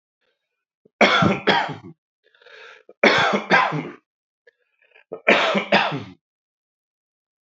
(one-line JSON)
{"three_cough_length": "7.4 s", "three_cough_amplitude": 28835, "three_cough_signal_mean_std_ratio": 0.41, "survey_phase": "beta (2021-08-13 to 2022-03-07)", "age": "45-64", "gender": "Male", "wearing_mask": "No", "symptom_none": true, "symptom_onset": "3 days", "smoker_status": "Current smoker (e-cigarettes or vapes only)", "respiratory_condition_asthma": false, "respiratory_condition_other": false, "recruitment_source": "Test and Trace", "submission_delay": "2 days", "covid_test_result": "Positive", "covid_test_method": "RT-qPCR", "covid_ct_value": 22.1, "covid_ct_gene": "ORF1ab gene", "covid_ct_mean": 22.3, "covid_viral_load": "47000 copies/ml", "covid_viral_load_category": "Low viral load (10K-1M copies/ml)"}